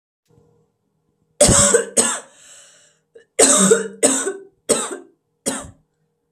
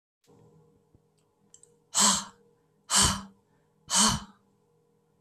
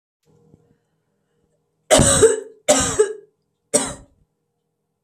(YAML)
cough_length: 6.3 s
cough_amplitude: 32768
cough_signal_mean_std_ratio: 0.42
exhalation_length: 5.2 s
exhalation_amplitude: 12042
exhalation_signal_mean_std_ratio: 0.33
three_cough_length: 5.0 s
three_cough_amplitude: 32768
three_cough_signal_mean_std_ratio: 0.35
survey_phase: alpha (2021-03-01 to 2021-08-12)
age: 18-44
gender: Female
wearing_mask: 'No'
symptom_cough_any: true
symptom_shortness_of_breath: true
symptom_diarrhoea: true
symptom_fatigue: true
symptom_headache: true
smoker_status: Never smoked
respiratory_condition_asthma: false
respiratory_condition_other: false
recruitment_source: Test and Trace
submission_delay: 1 day
covid_test_result: Positive
covid_test_method: RT-qPCR